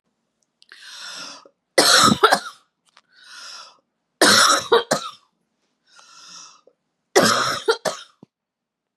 {"three_cough_length": "9.0 s", "three_cough_amplitude": 32714, "three_cough_signal_mean_std_ratio": 0.37, "survey_phase": "beta (2021-08-13 to 2022-03-07)", "age": "45-64", "gender": "Female", "wearing_mask": "No", "symptom_cough_any": true, "symptom_runny_or_blocked_nose": true, "symptom_shortness_of_breath": true, "symptom_sore_throat": true, "symptom_fatigue": true, "symptom_headache": true, "symptom_onset": "2 days", "smoker_status": "Never smoked", "respiratory_condition_asthma": false, "respiratory_condition_other": false, "recruitment_source": "Test and Trace", "submission_delay": "2 days", "covid_test_result": "Positive", "covid_test_method": "RT-qPCR", "covid_ct_value": 25.0, "covid_ct_gene": "N gene", "covid_ct_mean": 25.1, "covid_viral_load": "5800 copies/ml", "covid_viral_load_category": "Minimal viral load (< 10K copies/ml)"}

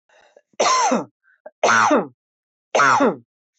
{"three_cough_length": "3.6 s", "three_cough_amplitude": 19862, "three_cough_signal_mean_std_ratio": 0.53, "survey_phase": "beta (2021-08-13 to 2022-03-07)", "age": "45-64", "gender": "Female", "wearing_mask": "No", "symptom_none": true, "symptom_onset": "13 days", "smoker_status": "Never smoked", "respiratory_condition_asthma": false, "respiratory_condition_other": false, "recruitment_source": "REACT", "submission_delay": "1 day", "covid_test_result": "Negative", "covid_test_method": "RT-qPCR"}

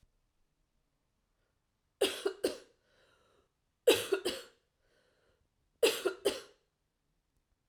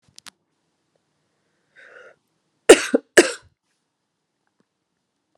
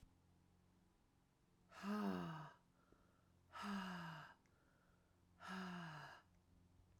{"three_cough_length": "7.7 s", "three_cough_amplitude": 6869, "three_cough_signal_mean_std_ratio": 0.27, "cough_length": "5.4 s", "cough_amplitude": 32768, "cough_signal_mean_std_ratio": 0.16, "exhalation_length": "7.0 s", "exhalation_amplitude": 597, "exhalation_signal_mean_std_ratio": 0.51, "survey_phase": "alpha (2021-03-01 to 2021-08-12)", "age": "45-64", "gender": "Female", "wearing_mask": "No", "symptom_cough_any": true, "symptom_shortness_of_breath": true, "symptom_fatigue": true, "symptom_onset": "3 days", "smoker_status": "Never smoked", "respiratory_condition_asthma": true, "respiratory_condition_other": false, "recruitment_source": "Test and Trace", "submission_delay": "2 days", "covid_test_result": "Positive", "covid_test_method": "RT-qPCR", "covid_ct_value": 22.3, "covid_ct_gene": "ORF1ab gene", "covid_ct_mean": 23.2, "covid_viral_load": "24000 copies/ml", "covid_viral_load_category": "Low viral load (10K-1M copies/ml)"}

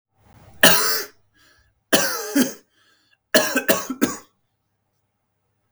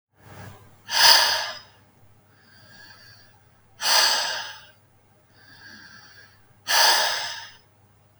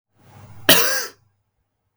{"three_cough_length": "5.7 s", "three_cough_amplitude": 32767, "three_cough_signal_mean_std_ratio": 0.37, "exhalation_length": "8.2 s", "exhalation_amplitude": 32766, "exhalation_signal_mean_std_ratio": 0.39, "cough_length": "2.0 s", "cough_amplitude": 32768, "cough_signal_mean_std_ratio": 0.34, "survey_phase": "beta (2021-08-13 to 2022-03-07)", "age": "18-44", "gender": "Male", "wearing_mask": "No", "symptom_none": true, "smoker_status": "Never smoked", "respiratory_condition_asthma": false, "respiratory_condition_other": false, "recruitment_source": "REACT", "submission_delay": "1 day", "covid_test_result": "Negative", "covid_test_method": "RT-qPCR", "influenza_a_test_result": "Negative", "influenza_b_test_result": "Negative"}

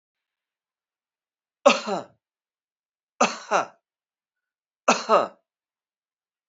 {"three_cough_length": "6.5 s", "three_cough_amplitude": 25451, "three_cough_signal_mean_std_ratio": 0.25, "survey_phase": "beta (2021-08-13 to 2022-03-07)", "age": "65+", "gender": "Male", "wearing_mask": "No", "symptom_cough_any": true, "symptom_runny_or_blocked_nose": true, "symptom_change_to_sense_of_smell_or_taste": true, "symptom_onset": "3 days", "smoker_status": "Ex-smoker", "respiratory_condition_asthma": false, "respiratory_condition_other": false, "recruitment_source": "Test and Trace", "submission_delay": "2 days", "covid_test_result": "Positive", "covid_test_method": "RT-qPCR"}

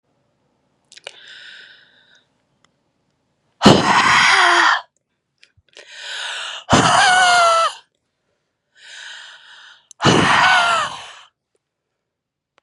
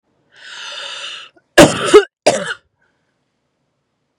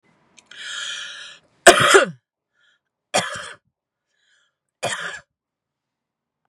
{"exhalation_length": "12.6 s", "exhalation_amplitude": 32768, "exhalation_signal_mean_std_ratio": 0.45, "cough_length": "4.2 s", "cough_amplitude": 32768, "cough_signal_mean_std_ratio": 0.3, "three_cough_length": "6.5 s", "three_cough_amplitude": 32768, "three_cough_signal_mean_std_ratio": 0.26, "survey_phase": "beta (2021-08-13 to 2022-03-07)", "age": "18-44", "gender": "Female", "wearing_mask": "No", "symptom_cough_any": true, "symptom_runny_or_blocked_nose": true, "symptom_headache": true, "symptom_onset": "13 days", "smoker_status": "Ex-smoker", "respiratory_condition_asthma": false, "respiratory_condition_other": false, "recruitment_source": "REACT", "submission_delay": "2 days", "covid_test_result": "Negative", "covid_test_method": "RT-qPCR", "influenza_a_test_result": "Negative", "influenza_b_test_result": "Negative"}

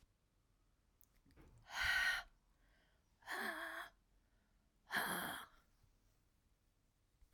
{"exhalation_length": "7.3 s", "exhalation_amplitude": 1738, "exhalation_signal_mean_std_ratio": 0.39, "survey_phase": "alpha (2021-03-01 to 2021-08-12)", "age": "45-64", "gender": "Female", "wearing_mask": "No", "symptom_cough_any": true, "symptom_fatigue": true, "symptom_headache": true, "symptom_onset": "6 days", "smoker_status": "Ex-smoker", "respiratory_condition_asthma": true, "respiratory_condition_other": false, "recruitment_source": "REACT", "submission_delay": "1 day", "covid_test_result": "Negative", "covid_test_method": "RT-qPCR"}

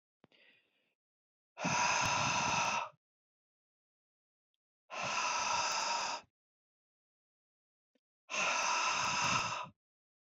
{"exhalation_length": "10.3 s", "exhalation_amplitude": 3549, "exhalation_signal_mean_std_ratio": 0.55, "survey_phase": "beta (2021-08-13 to 2022-03-07)", "age": "45-64", "gender": "Male", "wearing_mask": "No", "symptom_none": true, "smoker_status": "Ex-smoker", "respiratory_condition_asthma": false, "respiratory_condition_other": false, "recruitment_source": "Test and Trace", "submission_delay": "1 day", "covid_test_result": "Negative", "covid_test_method": "RT-qPCR"}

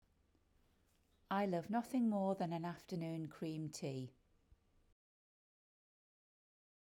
{"exhalation_length": "6.9 s", "exhalation_amplitude": 1581, "exhalation_signal_mean_std_ratio": 0.48, "survey_phase": "beta (2021-08-13 to 2022-03-07)", "age": "45-64", "gender": "Female", "wearing_mask": "No", "symptom_none": true, "smoker_status": "Never smoked", "respiratory_condition_asthma": false, "respiratory_condition_other": false, "recruitment_source": "REACT", "submission_delay": "1 day", "covid_test_result": "Negative", "covid_test_method": "RT-qPCR", "influenza_a_test_result": "Negative", "influenza_b_test_result": "Negative"}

